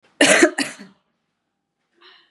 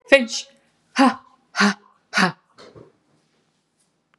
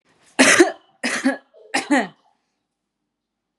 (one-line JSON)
{"cough_length": "2.3 s", "cough_amplitude": 31237, "cough_signal_mean_std_ratio": 0.32, "exhalation_length": "4.2 s", "exhalation_amplitude": 32767, "exhalation_signal_mean_std_ratio": 0.31, "three_cough_length": "3.6 s", "three_cough_amplitude": 32295, "three_cough_signal_mean_std_ratio": 0.36, "survey_phase": "beta (2021-08-13 to 2022-03-07)", "age": "18-44", "gender": "Female", "wearing_mask": "No", "symptom_runny_or_blocked_nose": true, "symptom_shortness_of_breath": true, "symptom_sore_throat": true, "symptom_fatigue": true, "smoker_status": "Ex-smoker", "respiratory_condition_asthma": false, "respiratory_condition_other": false, "recruitment_source": "Test and Trace", "submission_delay": "2 days", "covid_test_result": "Positive", "covid_test_method": "RT-qPCR", "covid_ct_value": 30.8, "covid_ct_gene": "ORF1ab gene", "covid_ct_mean": 32.5, "covid_viral_load": "22 copies/ml", "covid_viral_load_category": "Minimal viral load (< 10K copies/ml)"}